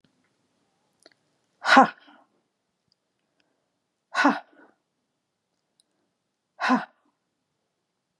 {
  "exhalation_length": "8.2 s",
  "exhalation_amplitude": 30114,
  "exhalation_signal_mean_std_ratio": 0.2,
  "survey_phase": "beta (2021-08-13 to 2022-03-07)",
  "age": "45-64",
  "gender": "Female",
  "wearing_mask": "No",
  "symptom_sore_throat": true,
  "smoker_status": "Never smoked",
  "respiratory_condition_asthma": false,
  "respiratory_condition_other": false,
  "recruitment_source": "REACT",
  "submission_delay": "2 days",
  "covid_test_result": "Negative",
  "covid_test_method": "RT-qPCR",
  "influenza_a_test_result": "Negative",
  "influenza_b_test_result": "Negative"
}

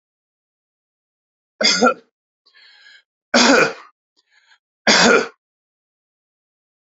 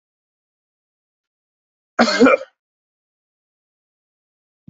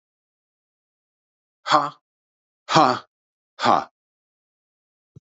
{
  "three_cough_length": "6.8 s",
  "three_cough_amplitude": 29639,
  "three_cough_signal_mean_std_ratio": 0.32,
  "cough_length": "4.7 s",
  "cough_amplitude": 27782,
  "cough_signal_mean_std_ratio": 0.21,
  "exhalation_length": "5.2 s",
  "exhalation_amplitude": 27837,
  "exhalation_signal_mean_std_ratio": 0.25,
  "survey_phase": "beta (2021-08-13 to 2022-03-07)",
  "age": "65+",
  "gender": "Male",
  "wearing_mask": "No",
  "symptom_cough_any": true,
  "symptom_sore_throat": true,
  "symptom_change_to_sense_of_smell_or_taste": true,
  "symptom_loss_of_taste": true,
  "symptom_onset": "3 days",
  "smoker_status": "Ex-smoker",
  "respiratory_condition_asthma": false,
  "respiratory_condition_other": false,
  "recruitment_source": "Test and Trace",
  "submission_delay": "2 days",
  "covid_test_result": "Positive",
  "covid_test_method": "RT-qPCR",
  "covid_ct_value": 19.1,
  "covid_ct_gene": "ORF1ab gene",
  "covid_ct_mean": 19.3,
  "covid_viral_load": "470000 copies/ml",
  "covid_viral_load_category": "Low viral load (10K-1M copies/ml)"
}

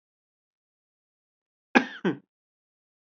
{
  "cough_length": "3.2 s",
  "cough_amplitude": 24340,
  "cough_signal_mean_std_ratio": 0.17,
  "survey_phase": "beta (2021-08-13 to 2022-03-07)",
  "age": "18-44",
  "gender": "Male",
  "wearing_mask": "No",
  "symptom_none": true,
  "smoker_status": "Never smoked",
  "respiratory_condition_asthma": false,
  "respiratory_condition_other": false,
  "recruitment_source": "REACT",
  "submission_delay": "1 day",
  "covid_test_result": "Negative",
  "covid_test_method": "RT-qPCR"
}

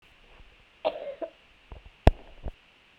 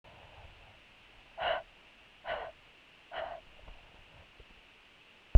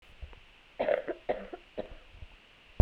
{
  "cough_length": "3.0 s",
  "cough_amplitude": 32767,
  "cough_signal_mean_std_ratio": 0.21,
  "exhalation_length": "5.4 s",
  "exhalation_amplitude": 11692,
  "exhalation_signal_mean_std_ratio": 0.21,
  "three_cough_length": "2.8 s",
  "three_cough_amplitude": 14320,
  "three_cough_signal_mean_std_ratio": 0.29,
  "survey_phase": "beta (2021-08-13 to 2022-03-07)",
  "age": "18-44",
  "gender": "Female",
  "wearing_mask": "No",
  "symptom_cough_any": true,
  "symptom_new_continuous_cough": true,
  "symptom_runny_or_blocked_nose": true,
  "symptom_shortness_of_breath": true,
  "symptom_sore_throat": true,
  "symptom_fatigue": true,
  "symptom_headache": true,
  "symptom_other": true,
  "symptom_onset": "2 days",
  "smoker_status": "Never smoked",
  "respiratory_condition_asthma": false,
  "respiratory_condition_other": false,
  "recruitment_source": "Test and Trace",
  "submission_delay": "2 days",
  "covid_test_result": "Positive",
  "covid_test_method": "RT-qPCR",
  "covid_ct_value": 21.0,
  "covid_ct_gene": "ORF1ab gene"
}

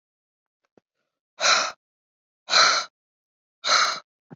{
  "exhalation_length": "4.4 s",
  "exhalation_amplitude": 21674,
  "exhalation_signal_mean_std_ratio": 0.37,
  "survey_phase": "beta (2021-08-13 to 2022-03-07)",
  "age": "45-64",
  "gender": "Female",
  "wearing_mask": "No",
  "symptom_none": true,
  "smoker_status": "Never smoked",
  "respiratory_condition_asthma": false,
  "respiratory_condition_other": false,
  "recruitment_source": "REACT",
  "submission_delay": "2 days",
  "covid_test_result": "Negative",
  "covid_test_method": "RT-qPCR"
}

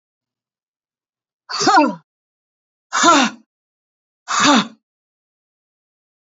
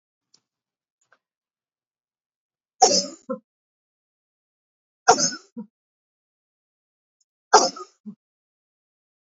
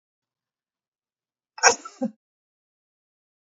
{
  "exhalation_length": "6.3 s",
  "exhalation_amplitude": 29102,
  "exhalation_signal_mean_std_ratio": 0.33,
  "three_cough_length": "9.2 s",
  "three_cough_amplitude": 29628,
  "three_cough_signal_mean_std_ratio": 0.19,
  "cough_length": "3.6 s",
  "cough_amplitude": 30015,
  "cough_signal_mean_std_ratio": 0.17,
  "survey_phase": "beta (2021-08-13 to 2022-03-07)",
  "age": "65+",
  "gender": "Female",
  "wearing_mask": "No",
  "symptom_none": true,
  "smoker_status": "Never smoked",
  "respiratory_condition_asthma": false,
  "respiratory_condition_other": false,
  "recruitment_source": "REACT",
  "submission_delay": "1 day",
  "covid_test_result": "Negative",
  "covid_test_method": "RT-qPCR",
  "influenza_a_test_result": "Negative",
  "influenza_b_test_result": "Negative"
}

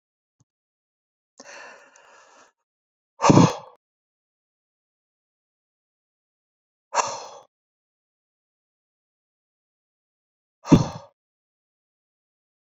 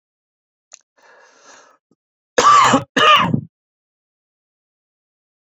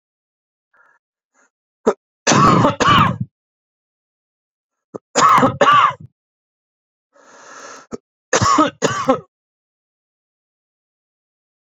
{
  "exhalation_length": "12.6 s",
  "exhalation_amplitude": 27604,
  "exhalation_signal_mean_std_ratio": 0.17,
  "cough_length": "5.5 s",
  "cough_amplitude": 27637,
  "cough_signal_mean_std_ratio": 0.32,
  "three_cough_length": "11.6 s",
  "three_cough_amplitude": 32767,
  "three_cough_signal_mean_std_ratio": 0.36,
  "survey_phase": "beta (2021-08-13 to 2022-03-07)",
  "age": "45-64",
  "gender": "Male",
  "wearing_mask": "No",
  "symptom_cough_any": true,
  "symptom_fatigue": true,
  "smoker_status": "Never smoked",
  "respiratory_condition_asthma": false,
  "respiratory_condition_other": false,
  "recruitment_source": "REACT",
  "submission_delay": "2 days",
  "covid_test_result": "Negative",
  "covid_test_method": "RT-qPCR"
}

